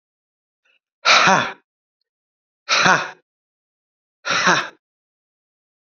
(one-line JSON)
{"exhalation_length": "5.8 s", "exhalation_amplitude": 31828, "exhalation_signal_mean_std_ratio": 0.34, "survey_phase": "beta (2021-08-13 to 2022-03-07)", "age": "65+", "gender": "Male", "wearing_mask": "No", "symptom_cough_any": true, "symptom_runny_or_blocked_nose": true, "symptom_onset": "12 days", "smoker_status": "Never smoked", "respiratory_condition_asthma": false, "respiratory_condition_other": false, "recruitment_source": "REACT", "submission_delay": "1 day", "covid_test_result": "Negative", "covid_test_method": "RT-qPCR"}